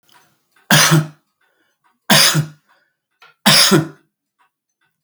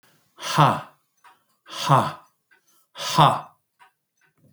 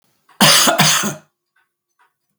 {
  "three_cough_length": "5.0 s",
  "three_cough_amplitude": 32768,
  "three_cough_signal_mean_std_ratio": 0.39,
  "exhalation_length": "4.5 s",
  "exhalation_amplitude": 26079,
  "exhalation_signal_mean_std_ratio": 0.35,
  "cough_length": "2.4 s",
  "cough_amplitude": 32768,
  "cough_signal_mean_std_ratio": 0.45,
  "survey_phase": "beta (2021-08-13 to 2022-03-07)",
  "age": "65+",
  "gender": "Male",
  "wearing_mask": "No",
  "symptom_none": true,
  "smoker_status": "Never smoked",
  "respiratory_condition_asthma": false,
  "respiratory_condition_other": false,
  "recruitment_source": "REACT",
  "submission_delay": "1 day",
  "covid_test_result": "Negative",
  "covid_test_method": "RT-qPCR"
}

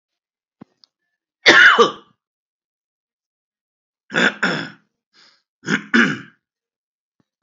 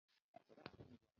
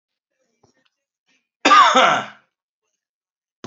{
  "three_cough_length": "7.4 s",
  "three_cough_amplitude": 30477,
  "three_cough_signal_mean_std_ratio": 0.29,
  "exhalation_length": "1.2 s",
  "exhalation_amplitude": 643,
  "exhalation_signal_mean_std_ratio": 0.41,
  "cough_length": "3.7 s",
  "cough_amplitude": 32767,
  "cough_signal_mean_std_ratio": 0.31,
  "survey_phase": "beta (2021-08-13 to 2022-03-07)",
  "age": "45-64",
  "gender": "Male",
  "wearing_mask": "No",
  "symptom_none": true,
  "smoker_status": "Ex-smoker",
  "respiratory_condition_asthma": false,
  "respiratory_condition_other": false,
  "recruitment_source": "Test and Trace",
  "submission_delay": "-4 days",
  "covid_test_result": "Negative",
  "covid_test_method": "ePCR"
}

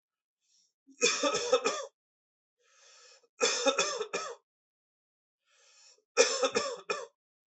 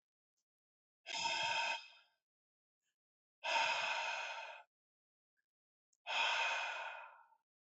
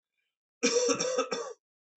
{
  "three_cough_length": "7.5 s",
  "three_cough_amplitude": 11133,
  "three_cough_signal_mean_std_ratio": 0.41,
  "exhalation_length": "7.7 s",
  "exhalation_amplitude": 2485,
  "exhalation_signal_mean_std_ratio": 0.51,
  "cough_length": "2.0 s",
  "cough_amplitude": 7335,
  "cough_signal_mean_std_ratio": 0.54,
  "survey_phase": "beta (2021-08-13 to 2022-03-07)",
  "age": "18-44",
  "gender": "Male",
  "wearing_mask": "No",
  "symptom_runny_or_blocked_nose": true,
  "symptom_fatigue": true,
  "smoker_status": "Never smoked",
  "respiratory_condition_asthma": false,
  "respiratory_condition_other": false,
  "recruitment_source": "Test and Trace",
  "submission_delay": "2 days",
  "covid_test_result": "Positive",
  "covid_test_method": "RT-qPCR",
  "covid_ct_value": 19.7,
  "covid_ct_gene": "ORF1ab gene",
  "covid_ct_mean": 20.0,
  "covid_viral_load": "280000 copies/ml",
  "covid_viral_load_category": "Low viral load (10K-1M copies/ml)"
}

